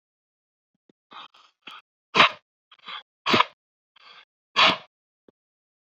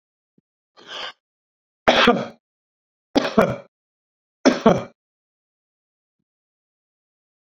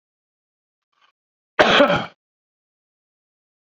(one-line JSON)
{"exhalation_length": "6.0 s", "exhalation_amplitude": 27255, "exhalation_signal_mean_std_ratio": 0.23, "three_cough_length": "7.5 s", "three_cough_amplitude": 29289, "three_cough_signal_mean_std_ratio": 0.27, "cough_length": "3.8 s", "cough_amplitude": 32768, "cough_signal_mean_std_ratio": 0.26, "survey_phase": "beta (2021-08-13 to 2022-03-07)", "age": "45-64", "gender": "Male", "wearing_mask": "No", "symptom_none": true, "smoker_status": "Ex-smoker", "respiratory_condition_asthma": false, "respiratory_condition_other": false, "recruitment_source": "REACT", "submission_delay": "1 day", "covid_test_result": "Negative", "covid_test_method": "RT-qPCR"}